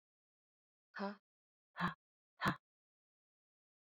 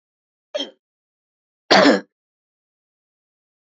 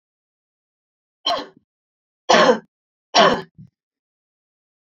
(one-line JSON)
{"exhalation_length": "3.9 s", "exhalation_amplitude": 2826, "exhalation_signal_mean_std_ratio": 0.25, "cough_length": "3.7 s", "cough_amplitude": 32768, "cough_signal_mean_std_ratio": 0.24, "three_cough_length": "4.9 s", "three_cough_amplitude": 30358, "three_cough_signal_mean_std_ratio": 0.28, "survey_phase": "beta (2021-08-13 to 2022-03-07)", "age": "45-64", "gender": "Female", "wearing_mask": "No", "symptom_none": true, "smoker_status": "Never smoked", "respiratory_condition_asthma": false, "respiratory_condition_other": false, "recruitment_source": "REACT", "submission_delay": "1 day", "covid_test_result": "Negative", "covid_test_method": "RT-qPCR"}